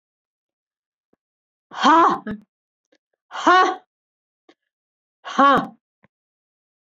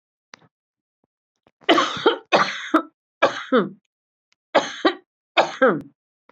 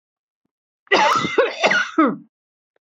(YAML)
exhalation_length: 6.8 s
exhalation_amplitude: 25176
exhalation_signal_mean_std_ratio: 0.32
three_cough_length: 6.3 s
three_cough_amplitude: 26745
three_cough_signal_mean_std_ratio: 0.38
cough_length: 2.8 s
cough_amplitude: 26065
cough_signal_mean_std_ratio: 0.52
survey_phase: beta (2021-08-13 to 2022-03-07)
age: 45-64
gender: Female
wearing_mask: 'No'
symptom_cough_any: true
symptom_runny_or_blocked_nose: true
symptom_sore_throat: true
symptom_fatigue: true
symptom_headache: true
symptom_change_to_sense_of_smell_or_taste: true
symptom_loss_of_taste: true
symptom_other: true
symptom_onset: 14 days
smoker_status: Never smoked
respiratory_condition_asthma: false
respiratory_condition_other: false
recruitment_source: Test and Trace
submission_delay: 2 days
covid_test_result: Positive
covid_test_method: RT-qPCR